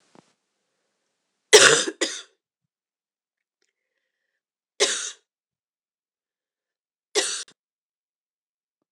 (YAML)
three_cough_length: 8.9 s
three_cough_amplitude: 26028
three_cough_signal_mean_std_ratio: 0.21
survey_phase: beta (2021-08-13 to 2022-03-07)
age: 45-64
gender: Female
wearing_mask: 'No'
symptom_runny_or_blocked_nose: true
symptom_shortness_of_breath: true
symptom_abdominal_pain: true
symptom_diarrhoea: true
symptom_fatigue: true
symptom_loss_of_taste: true
symptom_other: true
symptom_onset: 4 days
smoker_status: Never smoked
respiratory_condition_asthma: false
respiratory_condition_other: false
recruitment_source: Test and Trace
submission_delay: 2 days
covid_test_result: Positive
covid_test_method: RT-qPCR
covid_ct_value: 10.0
covid_ct_gene: ORF1ab gene